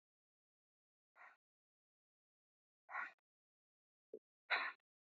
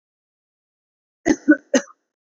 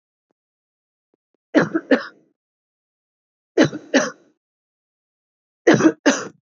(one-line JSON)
{"exhalation_length": "5.1 s", "exhalation_amplitude": 1868, "exhalation_signal_mean_std_ratio": 0.21, "cough_length": "2.2 s", "cough_amplitude": 24201, "cough_signal_mean_std_ratio": 0.24, "three_cough_length": "6.5 s", "three_cough_amplitude": 27497, "three_cough_signal_mean_std_ratio": 0.29, "survey_phase": "beta (2021-08-13 to 2022-03-07)", "age": "18-44", "gender": "Female", "wearing_mask": "No", "symptom_none": true, "smoker_status": "Never smoked", "respiratory_condition_asthma": false, "respiratory_condition_other": false, "recruitment_source": "Test and Trace", "submission_delay": "2 days", "covid_test_result": "Positive", "covid_test_method": "RT-qPCR", "covid_ct_value": 21.7, "covid_ct_gene": "N gene"}